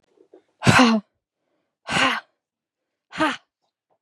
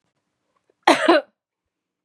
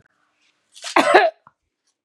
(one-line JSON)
{"exhalation_length": "4.0 s", "exhalation_amplitude": 27266, "exhalation_signal_mean_std_ratio": 0.35, "three_cough_length": "2.0 s", "three_cough_amplitude": 31116, "three_cough_signal_mean_std_ratio": 0.29, "cough_length": "2.0 s", "cough_amplitude": 32365, "cough_signal_mean_std_ratio": 0.33, "survey_phase": "beta (2021-08-13 to 2022-03-07)", "age": "18-44", "gender": "Female", "wearing_mask": "No", "symptom_cough_any": true, "symptom_runny_or_blocked_nose": true, "symptom_fatigue": true, "symptom_onset": "13 days", "smoker_status": "Never smoked", "respiratory_condition_asthma": true, "respiratory_condition_other": false, "recruitment_source": "REACT", "submission_delay": "1 day", "covid_test_result": "Negative", "covid_test_method": "RT-qPCR", "influenza_a_test_result": "Unknown/Void", "influenza_b_test_result": "Unknown/Void"}